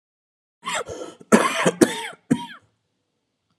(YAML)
cough_length: 3.6 s
cough_amplitude: 32767
cough_signal_mean_std_ratio: 0.35
survey_phase: alpha (2021-03-01 to 2021-08-12)
age: 45-64
gender: Male
wearing_mask: 'No'
symptom_cough_any: true
symptom_new_continuous_cough: true
symptom_fatigue: true
symptom_headache: true
symptom_change_to_sense_of_smell_or_taste: true
symptom_onset: 4 days
smoker_status: Ex-smoker
respiratory_condition_asthma: false
respiratory_condition_other: false
recruitment_source: Test and Trace
submission_delay: 2 days
covid_test_result: Positive
covid_test_method: RT-qPCR
covid_ct_value: 15.8
covid_ct_gene: ORF1ab gene
covid_ct_mean: 16.2
covid_viral_load: 4800000 copies/ml
covid_viral_load_category: High viral load (>1M copies/ml)